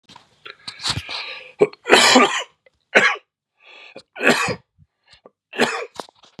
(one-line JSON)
{"three_cough_length": "6.4 s", "three_cough_amplitude": 32768, "three_cough_signal_mean_std_ratio": 0.39, "survey_phase": "beta (2021-08-13 to 2022-03-07)", "age": "45-64", "gender": "Male", "wearing_mask": "No", "symptom_cough_any": true, "symptom_new_continuous_cough": true, "symptom_runny_or_blocked_nose": true, "symptom_sore_throat": true, "symptom_fatigue": true, "symptom_headache": true, "symptom_onset": "2 days", "smoker_status": "Never smoked", "respiratory_condition_asthma": false, "respiratory_condition_other": false, "recruitment_source": "Test and Trace", "submission_delay": "1 day", "covid_test_result": "Positive", "covid_test_method": "RT-qPCR", "covid_ct_value": 25.1, "covid_ct_gene": "N gene"}